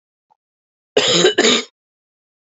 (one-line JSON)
{"cough_length": "2.6 s", "cough_amplitude": 30795, "cough_signal_mean_std_ratio": 0.4, "survey_phase": "beta (2021-08-13 to 2022-03-07)", "age": "45-64", "gender": "Female", "wearing_mask": "No", "symptom_cough_any": true, "symptom_new_continuous_cough": true, "symptom_runny_or_blocked_nose": true, "symptom_sore_throat": true, "symptom_abdominal_pain": true, "symptom_fatigue": true, "symptom_fever_high_temperature": true, "symptom_headache": true, "symptom_change_to_sense_of_smell_or_taste": true, "symptom_other": true, "symptom_onset": "4 days", "smoker_status": "Current smoker (e-cigarettes or vapes only)", "respiratory_condition_asthma": true, "respiratory_condition_other": false, "recruitment_source": "Test and Trace", "submission_delay": "2 days", "covid_test_result": "Positive", "covid_test_method": "RT-qPCR", "covid_ct_value": 22.6, "covid_ct_gene": "ORF1ab gene"}